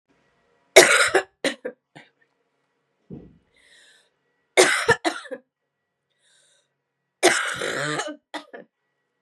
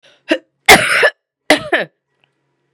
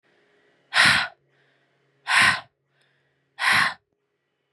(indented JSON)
{
  "three_cough_length": "9.2 s",
  "three_cough_amplitude": 32768,
  "three_cough_signal_mean_std_ratio": 0.3,
  "cough_length": "2.7 s",
  "cough_amplitude": 32768,
  "cough_signal_mean_std_ratio": 0.38,
  "exhalation_length": "4.5 s",
  "exhalation_amplitude": 24755,
  "exhalation_signal_mean_std_ratio": 0.37,
  "survey_phase": "beta (2021-08-13 to 2022-03-07)",
  "age": "18-44",
  "gender": "Female",
  "wearing_mask": "No",
  "symptom_cough_any": true,
  "symptom_runny_or_blocked_nose": true,
  "symptom_sore_throat": true,
  "symptom_fatigue": true,
  "symptom_onset": "4 days",
  "smoker_status": "Never smoked",
  "respiratory_condition_asthma": false,
  "respiratory_condition_other": false,
  "recruitment_source": "Test and Trace",
  "submission_delay": "1 day",
  "covid_test_result": "Positive",
  "covid_test_method": "ePCR"
}